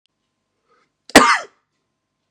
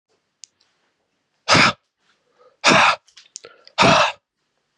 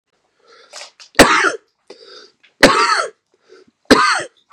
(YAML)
cough_length: 2.3 s
cough_amplitude: 32768
cough_signal_mean_std_ratio: 0.23
exhalation_length: 4.8 s
exhalation_amplitude: 30747
exhalation_signal_mean_std_ratio: 0.35
three_cough_length: 4.5 s
three_cough_amplitude: 32768
three_cough_signal_mean_std_ratio: 0.39
survey_phase: beta (2021-08-13 to 2022-03-07)
age: 18-44
gender: Male
wearing_mask: 'No'
symptom_none: true
smoker_status: Never smoked
respiratory_condition_asthma: false
respiratory_condition_other: false
recruitment_source: Test and Trace
submission_delay: 9 days
covid_test_result: Negative
covid_test_method: ePCR